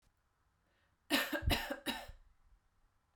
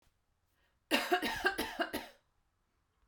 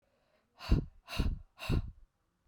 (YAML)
three_cough_length: 3.2 s
three_cough_amplitude: 4311
three_cough_signal_mean_std_ratio: 0.39
cough_length: 3.1 s
cough_amplitude: 5270
cough_signal_mean_std_ratio: 0.42
exhalation_length: 2.5 s
exhalation_amplitude: 6141
exhalation_signal_mean_std_ratio: 0.4
survey_phase: beta (2021-08-13 to 2022-03-07)
age: 18-44
gender: Female
wearing_mask: 'No'
symptom_runny_or_blocked_nose: true
symptom_fatigue: true
symptom_headache: true
symptom_onset: 3 days
smoker_status: Never smoked
respiratory_condition_asthma: false
respiratory_condition_other: false
recruitment_source: Test and Trace
submission_delay: 1 day
covid_test_result: Positive
covid_test_method: RT-qPCR